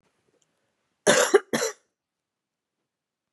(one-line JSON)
{"cough_length": "3.3 s", "cough_amplitude": 20510, "cough_signal_mean_std_ratio": 0.27, "survey_phase": "beta (2021-08-13 to 2022-03-07)", "age": "45-64", "gender": "Female", "wearing_mask": "No", "symptom_cough_any": true, "symptom_runny_or_blocked_nose": true, "symptom_shortness_of_breath": true, "symptom_sore_throat": true, "symptom_abdominal_pain": true, "symptom_diarrhoea": true, "symptom_fatigue": true, "symptom_fever_high_temperature": true, "symptom_headache": true, "symptom_change_to_sense_of_smell_or_taste": true, "symptom_loss_of_taste": true, "smoker_status": "Ex-smoker", "respiratory_condition_asthma": true, "respiratory_condition_other": false, "recruitment_source": "Test and Trace", "submission_delay": "3 days", "covid_test_result": "Positive", "covid_test_method": "ePCR"}